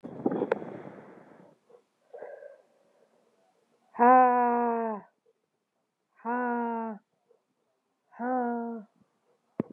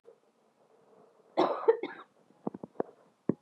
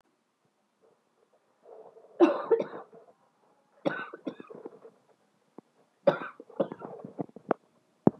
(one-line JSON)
{"exhalation_length": "9.7 s", "exhalation_amplitude": 10950, "exhalation_signal_mean_std_ratio": 0.39, "cough_length": "3.4 s", "cough_amplitude": 8959, "cough_signal_mean_std_ratio": 0.28, "three_cough_length": "8.2 s", "three_cough_amplitude": 18884, "three_cough_signal_mean_std_ratio": 0.25, "survey_phase": "beta (2021-08-13 to 2022-03-07)", "age": "18-44", "gender": "Female", "wearing_mask": "No", "symptom_runny_or_blocked_nose": true, "smoker_status": "Never smoked", "respiratory_condition_asthma": false, "respiratory_condition_other": false, "recruitment_source": "Test and Trace", "submission_delay": "2 days", "covid_test_result": "Positive", "covid_test_method": "RT-qPCR"}